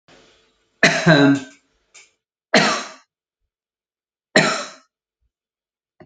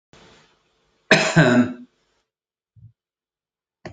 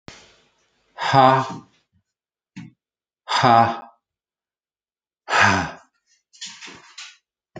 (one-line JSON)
{"three_cough_length": "6.1 s", "three_cough_amplitude": 32711, "three_cough_signal_mean_std_ratio": 0.33, "cough_length": "3.9 s", "cough_amplitude": 29039, "cough_signal_mean_std_ratio": 0.3, "exhalation_length": "7.6 s", "exhalation_amplitude": 27956, "exhalation_signal_mean_std_ratio": 0.33, "survey_phase": "alpha (2021-03-01 to 2021-08-12)", "age": "45-64", "gender": "Male", "wearing_mask": "No", "symptom_none": true, "smoker_status": "Ex-smoker", "respiratory_condition_asthma": false, "respiratory_condition_other": false, "recruitment_source": "REACT", "submission_delay": "2 days", "covid_test_result": "Negative", "covid_test_method": "RT-qPCR"}